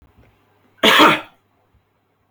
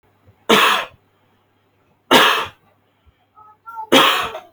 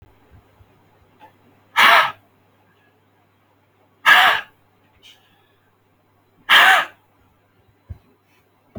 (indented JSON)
{
  "cough_length": "2.3 s",
  "cough_amplitude": 29732,
  "cough_signal_mean_std_ratio": 0.33,
  "three_cough_length": "4.5 s",
  "three_cough_amplitude": 32334,
  "three_cough_signal_mean_std_ratio": 0.4,
  "exhalation_length": "8.8 s",
  "exhalation_amplitude": 32767,
  "exhalation_signal_mean_std_ratio": 0.28,
  "survey_phase": "beta (2021-08-13 to 2022-03-07)",
  "age": "18-44",
  "gender": "Male",
  "wearing_mask": "No",
  "symptom_none": true,
  "smoker_status": "Never smoked",
  "respiratory_condition_asthma": false,
  "respiratory_condition_other": false,
  "recruitment_source": "REACT",
  "submission_delay": "1 day",
  "covid_test_result": "Negative",
  "covid_test_method": "RT-qPCR"
}